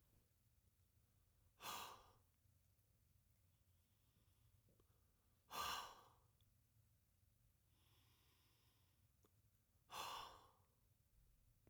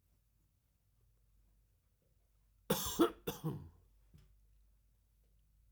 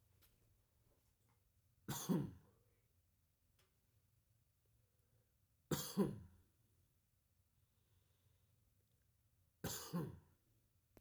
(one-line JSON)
{"exhalation_length": "11.7 s", "exhalation_amplitude": 507, "exhalation_signal_mean_std_ratio": 0.36, "cough_length": "5.7 s", "cough_amplitude": 3646, "cough_signal_mean_std_ratio": 0.26, "three_cough_length": "11.0 s", "three_cough_amplitude": 1691, "three_cough_signal_mean_std_ratio": 0.28, "survey_phase": "beta (2021-08-13 to 2022-03-07)", "age": "45-64", "gender": "Male", "wearing_mask": "No", "symptom_cough_any": true, "symptom_runny_or_blocked_nose": true, "symptom_sore_throat": true, "symptom_onset": "2 days", "smoker_status": "Never smoked", "respiratory_condition_asthma": false, "respiratory_condition_other": false, "recruitment_source": "Test and Trace", "submission_delay": "2 days", "covid_test_result": "Positive", "covid_test_method": "RT-qPCR", "covid_ct_value": 22.6, "covid_ct_gene": "ORF1ab gene"}